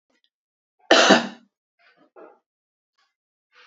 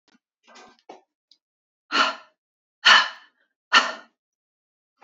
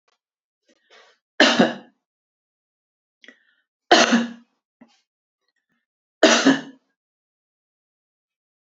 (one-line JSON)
{"cough_length": "3.7 s", "cough_amplitude": 27131, "cough_signal_mean_std_ratio": 0.24, "exhalation_length": "5.0 s", "exhalation_amplitude": 27792, "exhalation_signal_mean_std_ratio": 0.26, "three_cough_length": "8.8 s", "three_cough_amplitude": 32768, "three_cough_signal_mean_std_ratio": 0.26, "survey_phase": "alpha (2021-03-01 to 2021-08-12)", "age": "45-64", "gender": "Female", "wearing_mask": "No", "symptom_none": true, "smoker_status": "Never smoked", "respiratory_condition_asthma": false, "respiratory_condition_other": false, "recruitment_source": "REACT", "submission_delay": "1 day", "covid_test_result": "Negative", "covid_test_method": "RT-qPCR"}